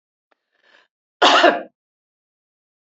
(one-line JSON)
{"cough_length": "2.9 s", "cough_amplitude": 28273, "cough_signal_mean_std_ratio": 0.28, "survey_phase": "beta (2021-08-13 to 2022-03-07)", "age": "65+", "gender": "Female", "wearing_mask": "No", "symptom_none": true, "smoker_status": "Ex-smoker", "respiratory_condition_asthma": false, "respiratory_condition_other": false, "recruitment_source": "REACT", "submission_delay": "2 days", "covid_test_result": "Negative", "covid_test_method": "RT-qPCR", "influenza_a_test_result": "Negative", "influenza_b_test_result": "Negative"}